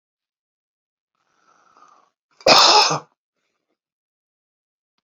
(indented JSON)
{
  "cough_length": "5.0 s",
  "cough_amplitude": 32768,
  "cough_signal_mean_std_ratio": 0.25,
  "survey_phase": "beta (2021-08-13 to 2022-03-07)",
  "age": "65+",
  "gender": "Male",
  "wearing_mask": "No",
  "symptom_none": true,
  "smoker_status": "Never smoked",
  "respiratory_condition_asthma": false,
  "respiratory_condition_other": false,
  "recruitment_source": "REACT",
  "submission_delay": "2 days",
  "covid_test_result": "Negative",
  "covid_test_method": "RT-qPCR",
  "influenza_a_test_result": "Unknown/Void",
  "influenza_b_test_result": "Unknown/Void"
}